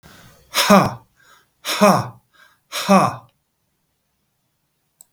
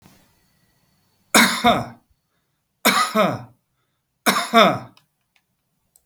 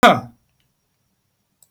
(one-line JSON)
{"exhalation_length": "5.1 s", "exhalation_amplitude": 32768, "exhalation_signal_mean_std_ratio": 0.35, "three_cough_length": "6.1 s", "three_cough_amplitude": 32768, "three_cough_signal_mean_std_ratio": 0.36, "cough_length": "1.7 s", "cough_amplitude": 32768, "cough_signal_mean_std_ratio": 0.23, "survey_phase": "beta (2021-08-13 to 2022-03-07)", "age": "45-64", "gender": "Male", "wearing_mask": "No", "symptom_none": true, "smoker_status": "Ex-smoker", "respiratory_condition_asthma": false, "respiratory_condition_other": false, "recruitment_source": "REACT", "submission_delay": "2 days", "covid_test_result": "Negative", "covid_test_method": "RT-qPCR", "influenza_a_test_result": "Negative", "influenza_b_test_result": "Negative"}